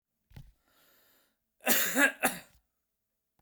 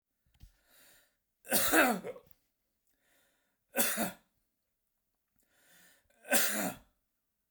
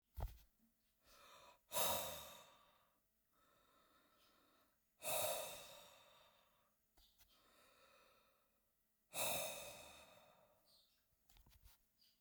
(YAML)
cough_length: 3.4 s
cough_amplitude: 9260
cough_signal_mean_std_ratio: 0.32
three_cough_length: 7.5 s
three_cough_amplitude: 8507
three_cough_signal_mean_std_ratio: 0.33
exhalation_length: 12.2 s
exhalation_amplitude: 1578
exhalation_signal_mean_std_ratio: 0.35
survey_phase: beta (2021-08-13 to 2022-03-07)
age: 45-64
gender: Male
wearing_mask: 'No'
symptom_none: true
smoker_status: Ex-smoker
respiratory_condition_asthma: false
respiratory_condition_other: false
recruitment_source: REACT
submission_delay: 2 days
covid_test_result: Negative
covid_test_method: RT-qPCR